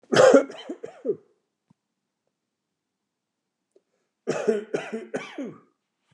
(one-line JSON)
{"cough_length": "6.1 s", "cough_amplitude": 26036, "cough_signal_mean_std_ratio": 0.29, "survey_phase": "beta (2021-08-13 to 2022-03-07)", "age": "45-64", "gender": "Male", "wearing_mask": "No", "symptom_other": true, "symptom_onset": "5 days", "smoker_status": "Never smoked", "respiratory_condition_asthma": false, "respiratory_condition_other": false, "recruitment_source": "REACT", "submission_delay": "3 days", "covid_test_result": "Negative", "covid_test_method": "RT-qPCR", "influenza_a_test_result": "Negative", "influenza_b_test_result": "Negative"}